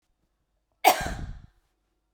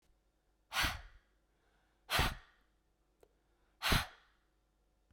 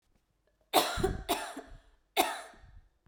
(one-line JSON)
{"cough_length": "2.1 s", "cough_amplitude": 23816, "cough_signal_mean_std_ratio": 0.27, "exhalation_length": "5.1 s", "exhalation_amplitude": 5840, "exhalation_signal_mean_std_ratio": 0.3, "three_cough_length": "3.1 s", "three_cough_amplitude": 13233, "three_cough_signal_mean_std_ratio": 0.41, "survey_phase": "beta (2021-08-13 to 2022-03-07)", "age": "18-44", "gender": "Female", "wearing_mask": "No", "symptom_sore_throat": true, "smoker_status": "Never smoked", "respiratory_condition_asthma": false, "respiratory_condition_other": false, "recruitment_source": "Test and Trace", "submission_delay": "1 day", "covid_test_result": "Positive", "covid_test_method": "RT-qPCR", "covid_ct_value": 24.2, "covid_ct_gene": "N gene"}